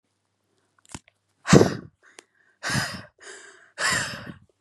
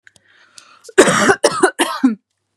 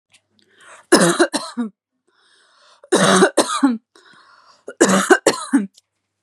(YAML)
exhalation_length: 4.6 s
exhalation_amplitude: 32767
exhalation_signal_mean_std_ratio: 0.3
cough_length: 2.6 s
cough_amplitude: 32768
cough_signal_mean_std_ratio: 0.45
three_cough_length: 6.2 s
three_cough_amplitude: 32768
three_cough_signal_mean_std_ratio: 0.43
survey_phase: beta (2021-08-13 to 2022-03-07)
age: 18-44
gender: Female
wearing_mask: 'No'
symptom_none: true
smoker_status: Never smoked
respiratory_condition_asthma: false
respiratory_condition_other: false
recruitment_source: REACT
submission_delay: 0 days
covid_test_result: Negative
covid_test_method: RT-qPCR
influenza_a_test_result: Negative
influenza_b_test_result: Negative